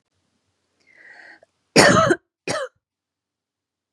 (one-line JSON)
{"cough_length": "3.9 s", "cough_amplitude": 32767, "cough_signal_mean_std_ratio": 0.29, "survey_phase": "beta (2021-08-13 to 2022-03-07)", "age": "18-44", "gender": "Female", "wearing_mask": "No", "symptom_fatigue": true, "symptom_onset": "12 days", "smoker_status": "Never smoked", "respiratory_condition_asthma": false, "respiratory_condition_other": false, "recruitment_source": "REACT", "submission_delay": "3 days", "covid_test_result": "Negative", "covid_test_method": "RT-qPCR", "influenza_a_test_result": "Negative", "influenza_b_test_result": "Negative"}